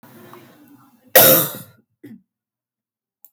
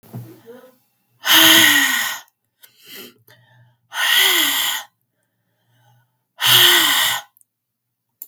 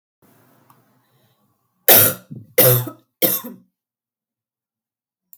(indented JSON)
{
  "cough_length": "3.3 s",
  "cough_amplitude": 32768,
  "cough_signal_mean_std_ratio": 0.27,
  "exhalation_length": "8.3 s",
  "exhalation_amplitude": 32768,
  "exhalation_signal_mean_std_ratio": 0.46,
  "three_cough_length": "5.4 s",
  "three_cough_amplitude": 32768,
  "three_cough_signal_mean_std_ratio": 0.29,
  "survey_phase": "beta (2021-08-13 to 2022-03-07)",
  "age": "18-44",
  "gender": "Female",
  "wearing_mask": "No",
  "symptom_cough_any": true,
  "symptom_runny_or_blocked_nose": true,
  "symptom_fatigue": true,
  "symptom_other": true,
  "symptom_onset": "2 days",
  "smoker_status": "Never smoked",
  "respiratory_condition_asthma": false,
  "respiratory_condition_other": false,
  "recruitment_source": "Test and Trace",
  "submission_delay": "1 day",
  "covid_test_result": "Positive",
  "covid_test_method": "ePCR"
}